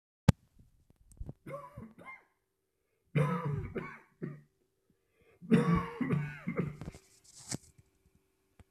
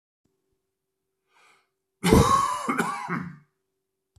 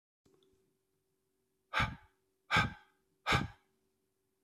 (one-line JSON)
{"three_cough_length": "8.7 s", "three_cough_amplitude": 19407, "three_cough_signal_mean_std_ratio": 0.35, "cough_length": "4.2 s", "cough_amplitude": 23310, "cough_signal_mean_std_ratio": 0.37, "exhalation_length": "4.4 s", "exhalation_amplitude": 5154, "exhalation_signal_mean_std_ratio": 0.28, "survey_phase": "beta (2021-08-13 to 2022-03-07)", "age": "45-64", "gender": "Male", "wearing_mask": "No", "symptom_cough_any": true, "symptom_runny_or_blocked_nose": true, "symptom_shortness_of_breath": true, "symptom_diarrhoea": true, "symptom_fatigue": true, "symptom_fever_high_temperature": true, "symptom_headache": true, "symptom_change_to_sense_of_smell_or_taste": true, "symptom_loss_of_taste": true, "symptom_onset": "5 days", "smoker_status": "Ex-smoker", "respiratory_condition_asthma": false, "respiratory_condition_other": false, "recruitment_source": "Test and Trace", "submission_delay": "2 days", "covid_test_result": "Positive", "covid_test_method": "RT-qPCR", "covid_ct_value": 13.3, "covid_ct_gene": "ORF1ab gene", "covid_ct_mean": 13.6, "covid_viral_load": "35000000 copies/ml", "covid_viral_load_category": "High viral load (>1M copies/ml)"}